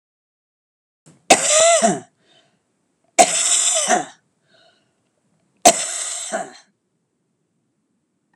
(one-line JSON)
{"three_cough_length": "8.4 s", "three_cough_amplitude": 32768, "three_cough_signal_mean_std_ratio": 0.36, "survey_phase": "alpha (2021-03-01 to 2021-08-12)", "age": "65+", "gender": "Female", "wearing_mask": "No", "symptom_none": true, "smoker_status": "Ex-smoker", "respiratory_condition_asthma": false, "respiratory_condition_other": false, "recruitment_source": "REACT", "submission_delay": "2 days", "covid_test_result": "Negative", "covid_test_method": "RT-qPCR"}